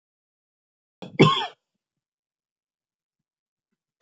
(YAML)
cough_length: 4.0 s
cough_amplitude: 25987
cough_signal_mean_std_ratio: 0.18
survey_phase: beta (2021-08-13 to 2022-03-07)
age: 45-64
gender: Female
wearing_mask: 'No'
symptom_none: true
smoker_status: Never smoked
respiratory_condition_asthma: false
respiratory_condition_other: false
recruitment_source: REACT
submission_delay: 2 days
covid_test_result: Negative
covid_test_method: RT-qPCR